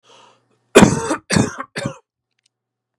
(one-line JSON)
{"cough_length": "3.0 s", "cough_amplitude": 32768, "cough_signal_mean_std_ratio": 0.32, "survey_phase": "beta (2021-08-13 to 2022-03-07)", "age": "45-64", "gender": "Male", "wearing_mask": "No", "symptom_none": true, "smoker_status": "Never smoked", "respiratory_condition_asthma": false, "respiratory_condition_other": false, "recruitment_source": "REACT", "submission_delay": "2 days", "covid_test_result": "Negative", "covid_test_method": "RT-qPCR", "influenza_a_test_result": "Negative", "influenza_b_test_result": "Negative"}